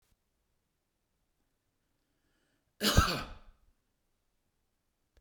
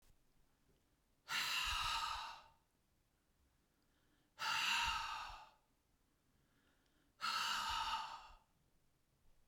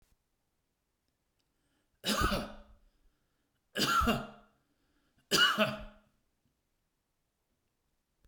{"cough_length": "5.2 s", "cough_amplitude": 9756, "cough_signal_mean_std_ratio": 0.21, "exhalation_length": "9.5 s", "exhalation_amplitude": 1726, "exhalation_signal_mean_std_ratio": 0.5, "three_cough_length": "8.3 s", "three_cough_amplitude": 6532, "three_cough_signal_mean_std_ratio": 0.33, "survey_phase": "beta (2021-08-13 to 2022-03-07)", "age": "65+", "gender": "Male", "wearing_mask": "No", "symptom_none": true, "smoker_status": "Ex-smoker", "respiratory_condition_asthma": false, "respiratory_condition_other": false, "recruitment_source": "REACT", "submission_delay": "2 days", "covid_test_result": "Negative", "covid_test_method": "RT-qPCR", "influenza_a_test_result": "Negative", "influenza_b_test_result": "Negative"}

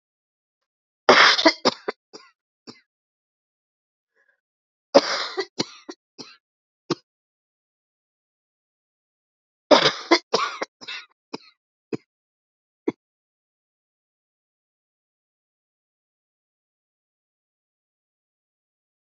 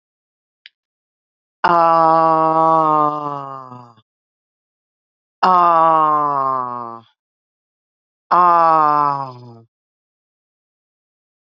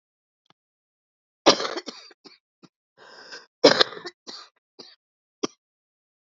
{"three_cough_length": "19.1 s", "three_cough_amplitude": 32768, "three_cough_signal_mean_std_ratio": 0.2, "exhalation_length": "11.5 s", "exhalation_amplitude": 29321, "exhalation_signal_mean_std_ratio": 0.44, "cough_length": "6.2 s", "cough_amplitude": 30068, "cough_signal_mean_std_ratio": 0.2, "survey_phase": "beta (2021-08-13 to 2022-03-07)", "age": "45-64", "gender": "Female", "wearing_mask": "No", "symptom_cough_any": true, "symptom_new_continuous_cough": true, "symptom_runny_or_blocked_nose": true, "symptom_sore_throat": true, "symptom_headache": true, "symptom_onset": "5 days", "smoker_status": "Ex-smoker", "respiratory_condition_asthma": false, "respiratory_condition_other": false, "recruitment_source": "Test and Trace", "submission_delay": "1 day", "covid_test_result": "Positive", "covid_test_method": "RT-qPCR", "covid_ct_value": 19.7, "covid_ct_gene": "ORF1ab gene", "covid_ct_mean": 20.6, "covid_viral_load": "170000 copies/ml", "covid_viral_load_category": "Low viral load (10K-1M copies/ml)"}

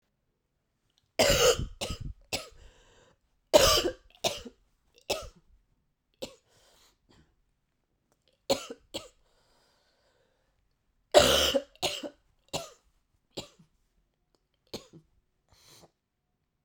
{"cough_length": "16.6 s", "cough_amplitude": 20019, "cough_signal_mean_std_ratio": 0.27, "survey_phase": "beta (2021-08-13 to 2022-03-07)", "age": "45-64", "gender": "Female", "wearing_mask": "No", "symptom_cough_any": true, "symptom_new_continuous_cough": true, "symptom_runny_or_blocked_nose": true, "symptom_shortness_of_breath": true, "symptom_sore_throat": true, "symptom_fatigue": true, "symptom_headache": true, "symptom_change_to_sense_of_smell_or_taste": true, "symptom_other": true, "smoker_status": "Never smoked", "respiratory_condition_asthma": false, "respiratory_condition_other": false, "recruitment_source": "Test and Trace", "submission_delay": "2 days", "covid_test_result": "Positive", "covid_test_method": "RT-qPCR", "covid_ct_value": 12.2, "covid_ct_gene": "N gene", "covid_ct_mean": 13.2, "covid_viral_load": "47000000 copies/ml", "covid_viral_load_category": "High viral load (>1M copies/ml)"}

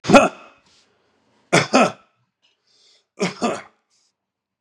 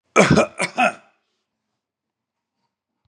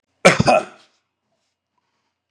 {"three_cough_length": "4.6 s", "three_cough_amplitude": 32768, "three_cough_signal_mean_std_ratio": 0.29, "exhalation_length": "3.1 s", "exhalation_amplitude": 32767, "exhalation_signal_mean_std_ratio": 0.31, "cough_length": "2.3 s", "cough_amplitude": 32768, "cough_signal_mean_std_ratio": 0.28, "survey_phase": "beta (2021-08-13 to 2022-03-07)", "age": "65+", "gender": "Male", "wearing_mask": "No", "symptom_none": true, "smoker_status": "Current smoker (1 to 10 cigarettes per day)", "respiratory_condition_asthma": false, "respiratory_condition_other": false, "recruitment_source": "REACT", "submission_delay": "0 days", "covid_test_result": "Negative", "covid_test_method": "RT-qPCR", "influenza_a_test_result": "Unknown/Void", "influenza_b_test_result": "Unknown/Void"}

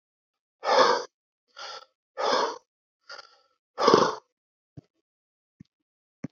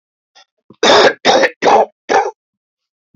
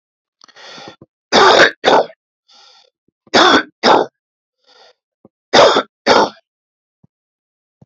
{"exhalation_length": "6.3 s", "exhalation_amplitude": 24476, "exhalation_signal_mean_std_ratio": 0.32, "cough_length": "3.2 s", "cough_amplitude": 30658, "cough_signal_mean_std_ratio": 0.47, "three_cough_length": "7.9 s", "three_cough_amplitude": 32768, "three_cough_signal_mean_std_ratio": 0.38, "survey_phase": "beta (2021-08-13 to 2022-03-07)", "age": "65+", "gender": "Male", "wearing_mask": "No", "symptom_none": true, "symptom_onset": "12 days", "smoker_status": "Ex-smoker", "respiratory_condition_asthma": false, "respiratory_condition_other": true, "recruitment_source": "REACT", "submission_delay": "1 day", "covid_test_result": "Negative", "covid_test_method": "RT-qPCR", "influenza_a_test_result": "Negative", "influenza_b_test_result": "Negative"}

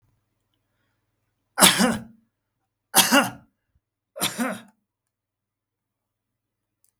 {"three_cough_length": "7.0 s", "three_cough_amplitude": 32766, "three_cough_signal_mean_std_ratio": 0.27, "survey_phase": "beta (2021-08-13 to 2022-03-07)", "age": "65+", "gender": "Male", "wearing_mask": "No", "symptom_none": true, "smoker_status": "Never smoked", "respiratory_condition_asthma": false, "respiratory_condition_other": false, "recruitment_source": "REACT", "submission_delay": "1 day", "covid_test_result": "Negative", "covid_test_method": "RT-qPCR", "influenza_a_test_result": "Negative", "influenza_b_test_result": "Negative"}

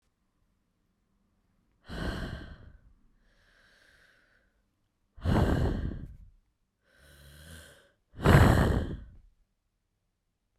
{"exhalation_length": "10.6 s", "exhalation_amplitude": 17294, "exhalation_signal_mean_std_ratio": 0.31, "survey_phase": "beta (2021-08-13 to 2022-03-07)", "age": "18-44", "gender": "Female", "wearing_mask": "No", "symptom_cough_any": true, "symptom_runny_or_blocked_nose": true, "symptom_shortness_of_breath": true, "symptom_sore_throat": true, "symptom_diarrhoea": true, "symptom_fatigue": true, "symptom_fever_high_temperature": true, "symptom_headache": true, "smoker_status": "Never smoked", "respiratory_condition_asthma": false, "respiratory_condition_other": true, "recruitment_source": "Test and Trace", "submission_delay": "2 days", "covid_test_result": "Positive", "covid_test_method": "RT-qPCR", "covid_ct_value": 25.6, "covid_ct_gene": "N gene"}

